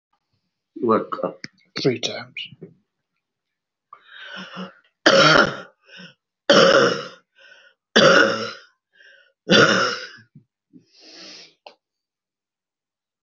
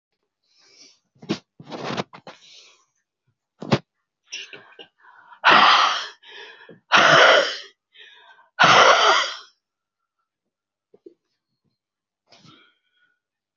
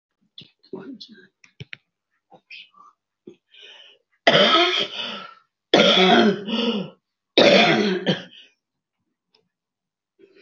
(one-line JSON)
{"three_cough_length": "13.2 s", "three_cough_amplitude": 30961, "three_cough_signal_mean_std_ratio": 0.36, "exhalation_length": "13.6 s", "exhalation_amplitude": 25225, "exhalation_signal_mean_std_ratio": 0.33, "cough_length": "10.4 s", "cough_amplitude": 26133, "cough_signal_mean_std_ratio": 0.4, "survey_phase": "alpha (2021-03-01 to 2021-08-12)", "age": "65+", "gender": "Female", "wearing_mask": "No", "symptom_cough_any": true, "symptom_new_continuous_cough": true, "symptom_shortness_of_breath": true, "symptom_diarrhoea": true, "symptom_fatigue": true, "symptom_fever_high_temperature": true, "symptom_change_to_sense_of_smell_or_taste": true, "symptom_loss_of_taste": true, "symptom_onset": "2 days", "smoker_status": "Ex-smoker", "respiratory_condition_asthma": false, "respiratory_condition_other": false, "recruitment_source": "Test and Trace", "submission_delay": "2 days", "covid_test_result": "Positive", "covid_test_method": "RT-qPCR", "covid_ct_value": 21.1, "covid_ct_gene": "N gene", "covid_ct_mean": 22.0, "covid_viral_load": "62000 copies/ml", "covid_viral_load_category": "Low viral load (10K-1M copies/ml)"}